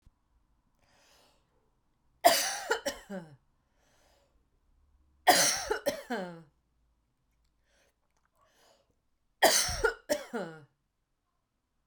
{"three_cough_length": "11.9 s", "three_cough_amplitude": 13381, "three_cough_signal_mean_std_ratio": 0.3, "survey_phase": "beta (2021-08-13 to 2022-03-07)", "age": "45-64", "gender": "Female", "wearing_mask": "No", "symptom_runny_or_blocked_nose": true, "symptom_sore_throat": true, "symptom_abdominal_pain": true, "symptom_diarrhoea": true, "symptom_fatigue": true, "symptom_fever_high_temperature": true, "symptom_headache": true, "smoker_status": "Ex-smoker", "respiratory_condition_asthma": false, "respiratory_condition_other": false, "recruitment_source": "Test and Trace", "submission_delay": "2 days", "covid_test_result": "Positive", "covid_test_method": "RT-qPCR", "covid_ct_value": 30.2, "covid_ct_gene": "ORF1ab gene"}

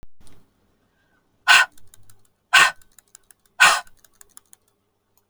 {"exhalation_length": "5.3 s", "exhalation_amplitude": 29983, "exhalation_signal_mean_std_ratio": 0.28, "survey_phase": "beta (2021-08-13 to 2022-03-07)", "age": "45-64", "gender": "Female", "wearing_mask": "No", "symptom_abdominal_pain": true, "symptom_onset": "12 days", "smoker_status": "Ex-smoker", "respiratory_condition_asthma": false, "respiratory_condition_other": true, "recruitment_source": "REACT", "submission_delay": "1 day", "covid_test_result": "Negative", "covid_test_method": "RT-qPCR"}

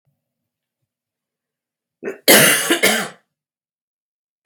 {"cough_length": "4.5 s", "cough_amplitude": 32768, "cough_signal_mean_std_ratio": 0.31, "survey_phase": "beta (2021-08-13 to 2022-03-07)", "age": "65+", "gender": "Female", "wearing_mask": "No", "symptom_fatigue": true, "symptom_headache": true, "symptom_onset": "5 days", "smoker_status": "Ex-smoker", "respiratory_condition_asthma": false, "respiratory_condition_other": false, "recruitment_source": "Test and Trace", "submission_delay": "2 days", "covid_test_result": "Positive", "covid_test_method": "RT-qPCR", "covid_ct_value": 19.5, "covid_ct_gene": "N gene", "covid_ct_mean": 20.3, "covid_viral_load": "220000 copies/ml", "covid_viral_load_category": "Low viral load (10K-1M copies/ml)"}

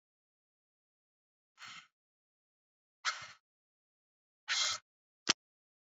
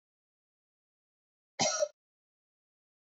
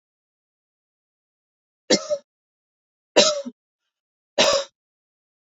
{"exhalation_length": "5.8 s", "exhalation_amplitude": 10587, "exhalation_signal_mean_std_ratio": 0.21, "cough_length": "3.2 s", "cough_amplitude": 4887, "cough_signal_mean_std_ratio": 0.23, "three_cough_length": "5.5 s", "three_cough_amplitude": 27103, "three_cough_signal_mean_std_ratio": 0.27, "survey_phase": "beta (2021-08-13 to 2022-03-07)", "age": "18-44", "gender": "Female", "wearing_mask": "No", "symptom_sore_throat": true, "symptom_abdominal_pain": true, "symptom_fatigue": true, "symptom_headache": true, "symptom_onset": "12 days", "smoker_status": "Ex-smoker", "respiratory_condition_asthma": false, "respiratory_condition_other": false, "recruitment_source": "REACT", "submission_delay": "4 days", "covid_test_result": "Negative", "covid_test_method": "RT-qPCR", "influenza_a_test_result": "Unknown/Void", "influenza_b_test_result": "Unknown/Void"}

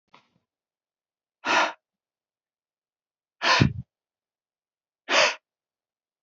{"exhalation_length": "6.2 s", "exhalation_amplitude": 19853, "exhalation_signal_mean_std_ratio": 0.28, "survey_phase": "beta (2021-08-13 to 2022-03-07)", "age": "18-44", "gender": "Male", "wearing_mask": "No", "symptom_cough_any": true, "symptom_sore_throat": true, "symptom_onset": "5 days", "smoker_status": "Never smoked", "respiratory_condition_asthma": false, "respiratory_condition_other": false, "recruitment_source": "REACT", "submission_delay": "1 day", "covid_test_result": "Negative", "covid_test_method": "RT-qPCR"}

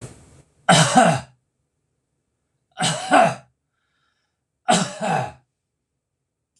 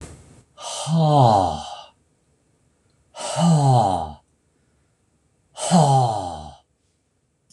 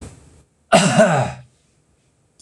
{"three_cough_length": "6.6 s", "three_cough_amplitude": 26027, "three_cough_signal_mean_std_ratio": 0.36, "exhalation_length": "7.5 s", "exhalation_amplitude": 24117, "exhalation_signal_mean_std_ratio": 0.48, "cough_length": "2.4 s", "cough_amplitude": 26028, "cough_signal_mean_std_ratio": 0.41, "survey_phase": "beta (2021-08-13 to 2022-03-07)", "age": "45-64", "gender": "Male", "wearing_mask": "No", "symptom_none": true, "smoker_status": "Ex-smoker", "respiratory_condition_asthma": false, "respiratory_condition_other": false, "recruitment_source": "REACT", "submission_delay": "1 day", "covid_test_result": "Negative", "covid_test_method": "RT-qPCR"}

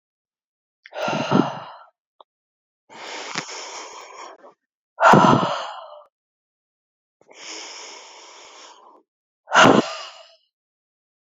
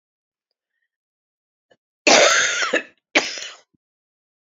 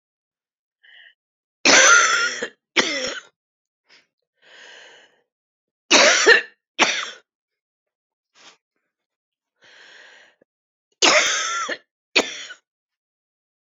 {"exhalation_length": "11.3 s", "exhalation_amplitude": 28339, "exhalation_signal_mean_std_ratio": 0.31, "cough_length": "4.5 s", "cough_amplitude": 29752, "cough_signal_mean_std_ratio": 0.34, "three_cough_length": "13.7 s", "three_cough_amplitude": 32767, "three_cough_signal_mean_std_ratio": 0.33, "survey_phase": "beta (2021-08-13 to 2022-03-07)", "age": "45-64", "gender": "Female", "wearing_mask": "No", "symptom_cough_any": true, "symptom_runny_or_blocked_nose": true, "symptom_sore_throat": true, "symptom_abdominal_pain": true, "symptom_fatigue": true, "symptom_headache": true, "symptom_other": true, "symptom_onset": "8 days", "smoker_status": "Current smoker (11 or more cigarettes per day)", "respiratory_condition_asthma": false, "respiratory_condition_other": false, "recruitment_source": "REACT", "submission_delay": "5 days", "covid_test_result": "Positive", "covid_test_method": "RT-qPCR", "covid_ct_value": 24.0, "covid_ct_gene": "E gene", "influenza_a_test_result": "Negative", "influenza_b_test_result": "Negative"}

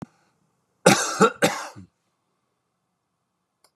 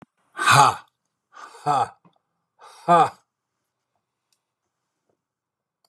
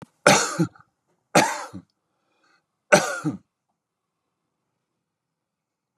{"cough_length": "3.8 s", "cough_amplitude": 31712, "cough_signal_mean_std_ratio": 0.27, "exhalation_length": "5.9 s", "exhalation_amplitude": 30660, "exhalation_signal_mean_std_ratio": 0.28, "three_cough_length": "6.0 s", "three_cough_amplitude": 32767, "three_cough_signal_mean_std_ratio": 0.27, "survey_phase": "beta (2021-08-13 to 2022-03-07)", "age": "65+", "gender": "Male", "wearing_mask": "No", "symptom_none": true, "smoker_status": "Ex-smoker", "respiratory_condition_asthma": false, "respiratory_condition_other": false, "recruitment_source": "REACT", "submission_delay": "1 day", "covid_test_result": "Negative", "covid_test_method": "RT-qPCR", "influenza_a_test_result": "Negative", "influenza_b_test_result": "Negative"}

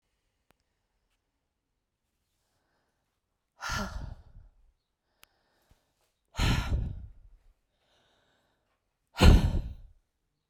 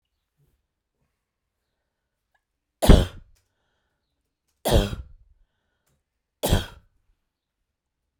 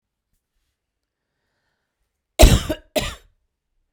{"exhalation_length": "10.5 s", "exhalation_amplitude": 21036, "exhalation_signal_mean_std_ratio": 0.24, "three_cough_length": "8.2 s", "three_cough_amplitude": 32767, "three_cough_signal_mean_std_ratio": 0.2, "cough_length": "3.9 s", "cough_amplitude": 32768, "cough_signal_mean_std_ratio": 0.21, "survey_phase": "beta (2021-08-13 to 2022-03-07)", "age": "45-64", "gender": "Female", "wearing_mask": "No", "symptom_none": true, "smoker_status": "Never smoked", "respiratory_condition_asthma": false, "respiratory_condition_other": false, "recruitment_source": "REACT", "submission_delay": "1 day", "covid_test_result": "Negative", "covid_test_method": "RT-qPCR"}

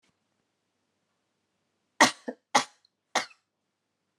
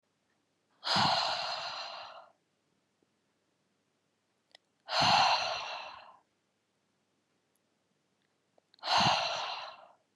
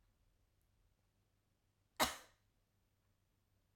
{"three_cough_length": "4.2 s", "three_cough_amplitude": 19039, "three_cough_signal_mean_std_ratio": 0.18, "exhalation_length": "10.2 s", "exhalation_amplitude": 7212, "exhalation_signal_mean_std_ratio": 0.4, "cough_length": "3.8 s", "cough_amplitude": 3718, "cough_signal_mean_std_ratio": 0.16, "survey_phase": "alpha (2021-03-01 to 2021-08-12)", "age": "18-44", "gender": "Female", "wearing_mask": "No", "symptom_none": true, "smoker_status": "Never smoked", "respiratory_condition_asthma": false, "respiratory_condition_other": false, "recruitment_source": "REACT", "submission_delay": "1 day", "covid_test_result": "Negative", "covid_test_method": "RT-qPCR"}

